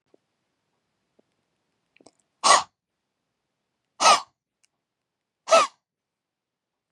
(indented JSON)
{
  "exhalation_length": "6.9 s",
  "exhalation_amplitude": 25582,
  "exhalation_signal_mean_std_ratio": 0.21,
  "survey_phase": "beta (2021-08-13 to 2022-03-07)",
  "age": "18-44",
  "gender": "Female",
  "wearing_mask": "No",
  "symptom_none": true,
  "smoker_status": "Never smoked",
  "respiratory_condition_asthma": true,
  "respiratory_condition_other": false,
  "recruitment_source": "REACT",
  "submission_delay": "2 days",
  "covid_test_result": "Negative",
  "covid_test_method": "RT-qPCR",
  "influenza_a_test_result": "Negative",
  "influenza_b_test_result": "Negative"
}